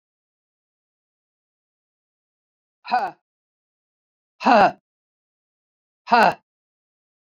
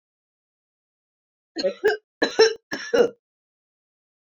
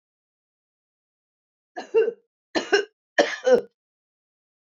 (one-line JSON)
{"exhalation_length": "7.3 s", "exhalation_amplitude": 28302, "exhalation_signal_mean_std_ratio": 0.23, "cough_length": "4.4 s", "cough_amplitude": 20004, "cough_signal_mean_std_ratio": 0.31, "three_cough_length": "4.7 s", "three_cough_amplitude": 19639, "three_cough_signal_mean_std_ratio": 0.3, "survey_phase": "beta (2021-08-13 to 2022-03-07)", "age": "65+", "gender": "Female", "wearing_mask": "No", "symptom_none": true, "smoker_status": "Never smoked", "respiratory_condition_asthma": false, "respiratory_condition_other": false, "recruitment_source": "REACT", "submission_delay": "1 day", "covid_test_result": "Negative", "covid_test_method": "RT-qPCR", "influenza_a_test_result": "Negative", "influenza_b_test_result": "Negative"}